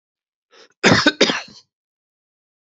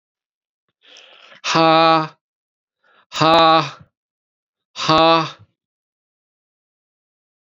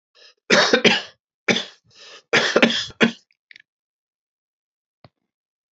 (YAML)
cough_length: 2.7 s
cough_amplitude: 32419
cough_signal_mean_std_ratio: 0.31
exhalation_length: 7.6 s
exhalation_amplitude: 29955
exhalation_signal_mean_std_ratio: 0.34
three_cough_length: 5.7 s
three_cough_amplitude: 30340
three_cough_signal_mean_std_ratio: 0.35
survey_phase: beta (2021-08-13 to 2022-03-07)
age: 45-64
gender: Male
wearing_mask: 'No'
symptom_cough_any: true
symptom_new_continuous_cough: true
symptom_runny_or_blocked_nose: true
symptom_sore_throat: true
symptom_diarrhoea: true
symptom_headache: true
smoker_status: Ex-smoker
respiratory_condition_asthma: false
respiratory_condition_other: false
recruitment_source: Test and Trace
submission_delay: 2 days
covid_test_result: Positive
covid_test_method: RT-qPCR
covid_ct_value: 19.7
covid_ct_gene: ORF1ab gene